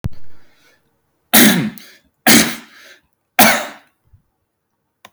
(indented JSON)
{
  "three_cough_length": "5.1 s",
  "three_cough_amplitude": 32768,
  "three_cough_signal_mean_std_ratio": 0.37,
  "survey_phase": "beta (2021-08-13 to 2022-03-07)",
  "age": "18-44",
  "gender": "Male",
  "wearing_mask": "No",
  "symptom_none": true,
  "smoker_status": "Never smoked",
  "respiratory_condition_asthma": false,
  "respiratory_condition_other": false,
  "recruitment_source": "REACT",
  "submission_delay": "4 days",
  "covid_test_result": "Negative",
  "covid_test_method": "RT-qPCR",
  "influenza_a_test_result": "Negative",
  "influenza_b_test_result": "Negative"
}